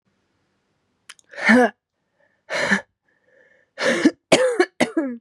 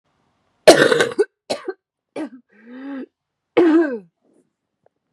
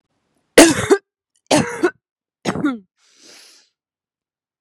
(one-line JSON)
{"exhalation_length": "5.2 s", "exhalation_amplitude": 32042, "exhalation_signal_mean_std_ratio": 0.4, "cough_length": "5.1 s", "cough_amplitude": 32768, "cough_signal_mean_std_ratio": 0.35, "three_cough_length": "4.6 s", "three_cough_amplitude": 32768, "three_cough_signal_mean_std_ratio": 0.3, "survey_phase": "beta (2021-08-13 to 2022-03-07)", "age": "18-44", "gender": "Female", "wearing_mask": "No", "symptom_cough_any": true, "symptom_runny_or_blocked_nose": true, "symptom_shortness_of_breath": true, "symptom_sore_throat": true, "symptom_fatigue": true, "symptom_fever_high_temperature": true, "symptom_headache": true, "symptom_change_to_sense_of_smell_or_taste": true, "symptom_loss_of_taste": true, "symptom_onset": "3 days", "smoker_status": "Never smoked", "respiratory_condition_asthma": true, "respiratory_condition_other": false, "recruitment_source": "Test and Trace", "submission_delay": "0 days", "covid_test_result": "Positive", "covid_test_method": "RT-qPCR"}